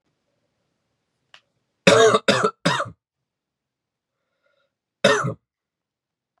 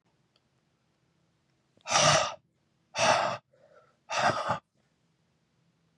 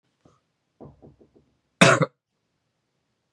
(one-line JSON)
{"three_cough_length": "6.4 s", "three_cough_amplitude": 32767, "three_cough_signal_mean_std_ratio": 0.3, "exhalation_length": "6.0 s", "exhalation_amplitude": 10117, "exhalation_signal_mean_std_ratio": 0.36, "cough_length": "3.3 s", "cough_amplitude": 32446, "cough_signal_mean_std_ratio": 0.2, "survey_phase": "beta (2021-08-13 to 2022-03-07)", "age": "18-44", "gender": "Male", "wearing_mask": "No", "symptom_cough_any": true, "symptom_runny_or_blocked_nose": true, "symptom_sore_throat": true, "symptom_fatigue": true, "symptom_other": true, "symptom_onset": "3 days", "smoker_status": "Never smoked", "respiratory_condition_asthma": false, "respiratory_condition_other": false, "recruitment_source": "Test and Trace", "submission_delay": "2 days", "covid_test_result": "Positive", "covid_test_method": "RT-qPCR", "covid_ct_value": 32.3, "covid_ct_gene": "ORF1ab gene"}